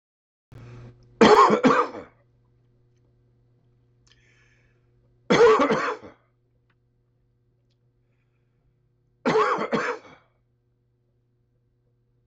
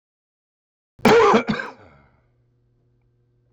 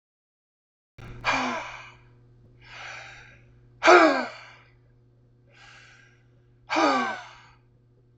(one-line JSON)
{"three_cough_length": "12.3 s", "three_cough_amplitude": 22624, "three_cough_signal_mean_std_ratio": 0.31, "cough_length": "3.5 s", "cough_amplitude": 22689, "cough_signal_mean_std_ratio": 0.32, "exhalation_length": "8.2 s", "exhalation_amplitude": 23250, "exhalation_signal_mean_std_ratio": 0.31, "survey_phase": "beta (2021-08-13 to 2022-03-07)", "age": "65+", "gender": "Male", "wearing_mask": "No", "symptom_runny_or_blocked_nose": true, "symptom_onset": "13 days", "smoker_status": "Ex-smoker", "respiratory_condition_asthma": true, "respiratory_condition_other": false, "recruitment_source": "REACT", "submission_delay": "1 day", "covid_test_result": "Negative", "covid_test_method": "RT-qPCR", "influenza_a_test_result": "Negative", "influenza_b_test_result": "Negative"}